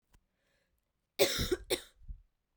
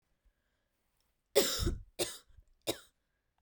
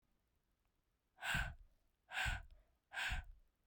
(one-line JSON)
{"cough_length": "2.6 s", "cough_amplitude": 8458, "cough_signal_mean_std_ratio": 0.33, "three_cough_length": "3.4 s", "three_cough_amplitude": 7977, "three_cough_signal_mean_std_ratio": 0.32, "exhalation_length": "3.7 s", "exhalation_amplitude": 1390, "exhalation_signal_mean_std_ratio": 0.44, "survey_phase": "beta (2021-08-13 to 2022-03-07)", "age": "18-44", "gender": "Female", "wearing_mask": "No", "symptom_cough_any": true, "symptom_new_continuous_cough": true, "symptom_runny_or_blocked_nose": true, "symptom_shortness_of_breath": true, "symptom_sore_throat": true, "symptom_fatigue": true, "symptom_fever_high_temperature": true, "symptom_headache": true, "symptom_change_to_sense_of_smell_or_taste": true, "symptom_loss_of_taste": true, "symptom_onset": "14 days", "smoker_status": "Never smoked", "respiratory_condition_asthma": false, "respiratory_condition_other": false, "recruitment_source": "Test and Trace", "submission_delay": "2 days", "covid_test_result": "Positive", "covid_test_method": "RT-qPCR"}